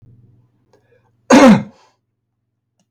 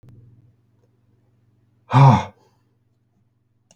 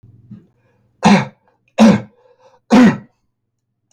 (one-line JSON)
{"cough_length": "2.9 s", "cough_amplitude": 32768, "cough_signal_mean_std_ratio": 0.29, "exhalation_length": "3.8 s", "exhalation_amplitude": 32259, "exhalation_signal_mean_std_ratio": 0.23, "three_cough_length": "3.9 s", "three_cough_amplitude": 32768, "three_cough_signal_mean_std_ratio": 0.35, "survey_phase": "beta (2021-08-13 to 2022-03-07)", "age": "65+", "gender": "Male", "wearing_mask": "No", "symptom_none": true, "smoker_status": "Never smoked", "respiratory_condition_asthma": false, "respiratory_condition_other": false, "recruitment_source": "REACT", "submission_delay": "3 days", "covid_test_result": "Negative", "covid_test_method": "RT-qPCR", "influenza_a_test_result": "Negative", "influenza_b_test_result": "Negative"}